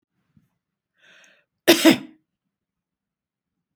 {"cough_length": "3.8 s", "cough_amplitude": 31903, "cough_signal_mean_std_ratio": 0.2, "survey_phase": "beta (2021-08-13 to 2022-03-07)", "age": "65+", "gender": "Female", "wearing_mask": "No", "symptom_none": true, "smoker_status": "Never smoked", "respiratory_condition_asthma": false, "respiratory_condition_other": false, "recruitment_source": "REACT", "submission_delay": "1 day", "covid_test_result": "Negative", "covid_test_method": "RT-qPCR"}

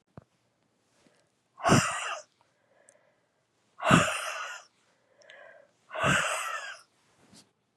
{"exhalation_length": "7.8 s", "exhalation_amplitude": 22879, "exhalation_signal_mean_std_ratio": 0.35, "survey_phase": "beta (2021-08-13 to 2022-03-07)", "age": "45-64", "gender": "Female", "wearing_mask": "No", "symptom_cough_any": true, "symptom_runny_or_blocked_nose": true, "symptom_shortness_of_breath": true, "symptom_sore_throat": true, "symptom_fatigue": true, "symptom_headache": true, "symptom_change_to_sense_of_smell_or_taste": true, "symptom_loss_of_taste": true, "symptom_onset": "2 days", "smoker_status": "Current smoker (1 to 10 cigarettes per day)", "respiratory_condition_asthma": false, "respiratory_condition_other": false, "recruitment_source": "Test and Trace", "submission_delay": "1 day", "covid_test_result": "Positive", "covid_test_method": "RT-qPCR", "covid_ct_value": 19.3, "covid_ct_gene": "ORF1ab gene", "covid_ct_mean": 19.8, "covid_viral_load": "330000 copies/ml", "covid_viral_load_category": "Low viral load (10K-1M copies/ml)"}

